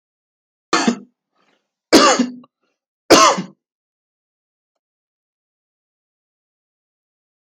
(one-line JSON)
{"three_cough_length": "7.6 s", "three_cough_amplitude": 32767, "three_cough_signal_mean_std_ratio": 0.26, "survey_phase": "beta (2021-08-13 to 2022-03-07)", "age": "18-44", "gender": "Male", "wearing_mask": "No", "symptom_none": true, "smoker_status": "Never smoked", "respiratory_condition_asthma": false, "respiratory_condition_other": false, "recruitment_source": "REACT", "submission_delay": "3 days", "covid_test_result": "Negative", "covid_test_method": "RT-qPCR"}